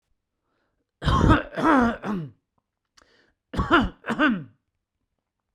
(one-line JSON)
{"cough_length": "5.5 s", "cough_amplitude": 18641, "cough_signal_mean_std_ratio": 0.43, "survey_phase": "beta (2021-08-13 to 2022-03-07)", "age": "45-64", "gender": "Male", "wearing_mask": "No", "symptom_none": true, "smoker_status": "Ex-smoker", "respiratory_condition_asthma": false, "respiratory_condition_other": false, "recruitment_source": "REACT", "submission_delay": "1 day", "covid_test_result": "Negative", "covid_test_method": "RT-qPCR"}